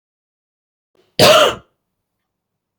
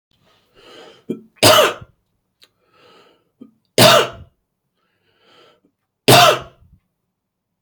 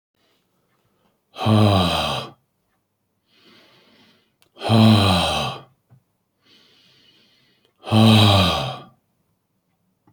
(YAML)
cough_length: 2.8 s
cough_amplitude: 32617
cough_signal_mean_std_ratio: 0.29
three_cough_length: 7.6 s
three_cough_amplitude: 32768
three_cough_signal_mean_std_ratio: 0.29
exhalation_length: 10.1 s
exhalation_amplitude: 26947
exhalation_signal_mean_std_ratio: 0.4
survey_phase: beta (2021-08-13 to 2022-03-07)
age: 45-64
gender: Male
wearing_mask: 'No'
symptom_none: true
smoker_status: Never smoked
respiratory_condition_asthma: false
respiratory_condition_other: false
recruitment_source: REACT
submission_delay: 1 day
covid_test_result: Negative
covid_test_method: RT-qPCR